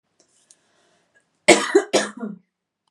cough_length: 2.9 s
cough_amplitude: 32768
cough_signal_mean_std_ratio: 0.29
survey_phase: beta (2021-08-13 to 2022-03-07)
age: 18-44
gender: Female
wearing_mask: 'No'
symptom_headache: true
smoker_status: Never smoked
respiratory_condition_asthma: false
respiratory_condition_other: false
recruitment_source: REACT
submission_delay: 3 days
covid_test_result: Negative
covid_test_method: RT-qPCR
influenza_a_test_result: Negative
influenza_b_test_result: Negative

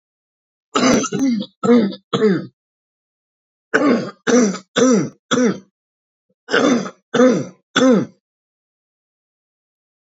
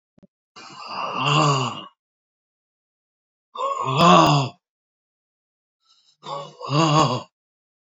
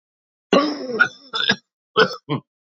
three_cough_length: 10.1 s
three_cough_amplitude: 32767
three_cough_signal_mean_std_ratio: 0.49
exhalation_length: 7.9 s
exhalation_amplitude: 27272
exhalation_signal_mean_std_ratio: 0.42
cough_length: 2.7 s
cough_amplitude: 27732
cough_signal_mean_std_ratio: 0.43
survey_phase: beta (2021-08-13 to 2022-03-07)
age: 65+
gender: Male
wearing_mask: 'No'
symptom_cough_any: true
symptom_new_continuous_cough: true
symptom_runny_or_blocked_nose: true
symptom_sore_throat: true
symptom_fatigue: true
symptom_headache: true
symptom_onset: 3 days
smoker_status: Ex-smoker
respiratory_condition_asthma: true
respiratory_condition_other: false
recruitment_source: Test and Trace
submission_delay: 2 days
covid_test_result: Positive
covid_test_method: RT-qPCR
covid_ct_value: 16.8
covid_ct_gene: ORF1ab gene
covid_ct_mean: 17.1
covid_viral_load: 2400000 copies/ml
covid_viral_load_category: High viral load (>1M copies/ml)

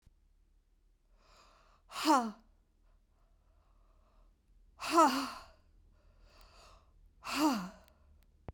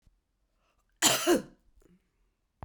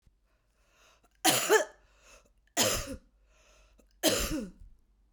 exhalation_length: 8.5 s
exhalation_amplitude: 6203
exhalation_signal_mean_std_ratio: 0.3
cough_length: 2.6 s
cough_amplitude: 12090
cough_signal_mean_std_ratio: 0.3
three_cough_length: 5.1 s
three_cough_amplitude: 10468
three_cough_signal_mean_std_ratio: 0.37
survey_phase: beta (2021-08-13 to 2022-03-07)
age: 65+
gender: Female
wearing_mask: 'No'
symptom_none: true
smoker_status: Ex-smoker
respiratory_condition_asthma: false
respiratory_condition_other: false
recruitment_source: REACT
submission_delay: 5 days
covid_test_result: Negative
covid_test_method: RT-qPCR
influenza_a_test_result: Negative
influenza_b_test_result: Negative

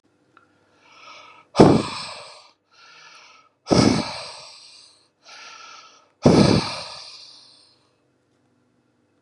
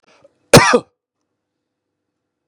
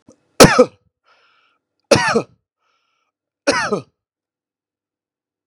exhalation_length: 9.2 s
exhalation_amplitude: 32768
exhalation_signal_mean_std_ratio: 0.3
cough_length: 2.5 s
cough_amplitude: 32768
cough_signal_mean_std_ratio: 0.24
three_cough_length: 5.5 s
three_cough_amplitude: 32768
three_cough_signal_mean_std_ratio: 0.26
survey_phase: beta (2021-08-13 to 2022-03-07)
age: 45-64
gender: Male
wearing_mask: 'No'
symptom_runny_or_blocked_nose: true
symptom_abdominal_pain: true
smoker_status: Ex-smoker
respiratory_condition_asthma: false
respiratory_condition_other: false
recruitment_source: REACT
submission_delay: 5 days
covid_test_result: Negative
covid_test_method: RT-qPCR
influenza_a_test_result: Negative
influenza_b_test_result: Negative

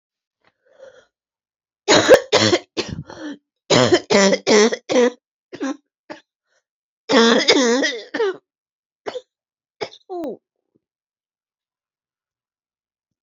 cough_length: 13.2 s
cough_amplitude: 32767
cough_signal_mean_std_ratio: 0.39
survey_phase: beta (2021-08-13 to 2022-03-07)
age: 45-64
gender: Female
wearing_mask: 'No'
symptom_cough_any: true
symptom_new_continuous_cough: true
symptom_runny_or_blocked_nose: true
symptom_shortness_of_breath: true
symptom_sore_throat: true
symptom_fatigue: true
symptom_change_to_sense_of_smell_or_taste: true
symptom_loss_of_taste: true
symptom_onset: 4 days
smoker_status: Never smoked
respiratory_condition_asthma: false
respiratory_condition_other: false
recruitment_source: Test and Trace
submission_delay: 2 days
covid_test_result: Positive
covid_test_method: RT-qPCR
covid_ct_value: 23.2
covid_ct_gene: ORF1ab gene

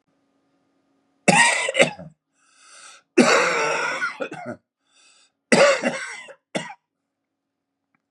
three_cough_length: 8.1 s
three_cough_amplitude: 32766
three_cough_signal_mean_std_ratio: 0.4
survey_phase: beta (2021-08-13 to 2022-03-07)
age: 45-64
gender: Male
wearing_mask: 'No'
symptom_none: true
symptom_onset: 6 days
smoker_status: Never smoked
respiratory_condition_asthma: false
respiratory_condition_other: false
recruitment_source: REACT
submission_delay: 2 days
covid_test_result: Negative
covid_test_method: RT-qPCR
influenza_a_test_result: Negative
influenza_b_test_result: Negative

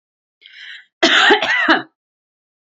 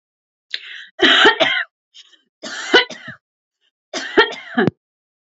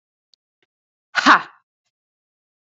cough_length: 2.7 s
cough_amplitude: 32768
cough_signal_mean_std_ratio: 0.45
three_cough_length: 5.4 s
three_cough_amplitude: 29517
three_cough_signal_mean_std_ratio: 0.38
exhalation_length: 2.6 s
exhalation_amplitude: 28075
exhalation_signal_mean_std_ratio: 0.2
survey_phase: beta (2021-08-13 to 2022-03-07)
age: 45-64
gender: Female
wearing_mask: 'No'
symptom_runny_or_blocked_nose: true
smoker_status: Never smoked
respiratory_condition_asthma: false
respiratory_condition_other: false
recruitment_source: REACT
submission_delay: 2 days
covid_test_result: Negative
covid_test_method: RT-qPCR
influenza_a_test_result: Negative
influenza_b_test_result: Negative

